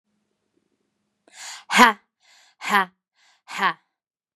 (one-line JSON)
{"exhalation_length": "4.4 s", "exhalation_amplitude": 32767, "exhalation_signal_mean_std_ratio": 0.25, "survey_phase": "beta (2021-08-13 to 2022-03-07)", "age": "18-44", "gender": "Female", "wearing_mask": "No", "symptom_none": true, "symptom_onset": "6 days", "smoker_status": "Never smoked", "respiratory_condition_asthma": false, "respiratory_condition_other": false, "recruitment_source": "REACT", "submission_delay": "1 day", "covid_test_result": "Positive", "covid_test_method": "RT-qPCR", "covid_ct_value": 29.7, "covid_ct_gene": "E gene", "influenza_a_test_result": "Negative", "influenza_b_test_result": "Negative"}